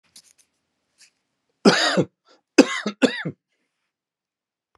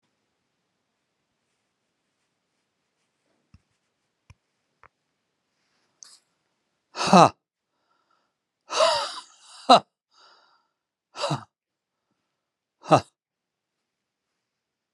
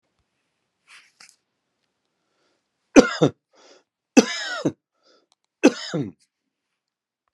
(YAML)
cough_length: 4.8 s
cough_amplitude: 32768
cough_signal_mean_std_ratio: 0.27
exhalation_length: 14.9 s
exhalation_amplitude: 29139
exhalation_signal_mean_std_ratio: 0.17
three_cough_length: 7.3 s
three_cough_amplitude: 32768
three_cough_signal_mean_std_ratio: 0.2
survey_phase: beta (2021-08-13 to 2022-03-07)
age: 45-64
gender: Male
wearing_mask: 'No'
symptom_cough_any: true
symptom_shortness_of_breath: true
symptom_onset: 12 days
smoker_status: Ex-smoker
respiratory_condition_asthma: false
respiratory_condition_other: true
recruitment_source: REACT
submission_delay: 2 days
covid_test_result: Negative
covid_test_method: RT-qPCR
influenza_a_test_result: Negative
influenza_b_test_result: Negative